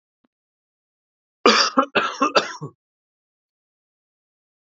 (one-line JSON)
{"three_cough_length": "4.8 s", "three_cough_amplitude": 29676, "three_cough_signal_mean_std_ratio": 0.29, "survey_phase": "beta (2021-08-13 to 2022-03-07)", "age": "18-44", "gender": "Male", "wearing_mask": "No", "symptom_fatigue": true, "symptom_onset": "13 days", "smoker_status": "Ex-smoker", "respiratory_condition_asthma": false, "respiratory_condition_other": false, "recruitment_source": "REACT", "submission_delay": "1 day", "covid_test_result": "Positive", "covid_test_method": "RT-qPCR", "covid_ct_value": 36.9, "covid_ct_gene": "E gene", "influenza_a_test_result": "Negative", "influenza_b_test_result": "Negative"}